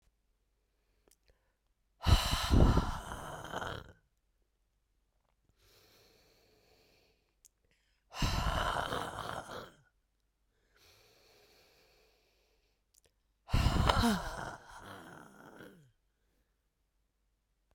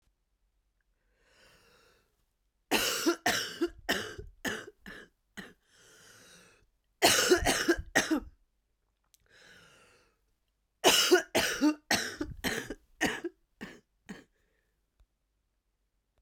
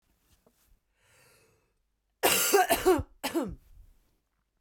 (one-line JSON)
{"exhalation_length": "17.7 s", "exhalation_amplitude": 12208, "exhalation_signal_mean_std_ratio": 0.33, "three_cough_length": "16.2 s", "three_cough_amplitude": 12767, "three_cough_signal_mean_std_ratio": 0.37, "cough_length": "4.6 s", "cough_amplitude": 10810, "cough_signal_mean_std_ratio": 0.37, "survey_phase": "beta (2021-08-13 to 2022-03-07)", "age": "18-44", "gender": "Female", "wearing_mask": "No", "symptom_new_continuous_cough": true, "symptom_runny_or_blocked_nose": true, "symptom_shortness_of_breath": true, "symptom_sore_throat": true, "symptom_fatigue": true, "symptom_fever_high_temperature": true, "symptom_headache": true, "symptom_onset": "4 days", "smoker_status": "Ex-smoker", "respiratory_condition_asthma": false, "respiratory_condition_other": true, "recruitment_source": "Test and Trace", "submission_delay": "1 day", "covid_test_result": "Positive", "covid_test_method": "RT-qPCR", "covid_ct_value": 26.9, "covid_ct_gene": "ORF1ab gene", "covid_ct_mean": 27.5, "covid_viral_load": "920 copies/ml", "covid_viral_load_category": "Minimal viral load (< 10K copies/ml)"}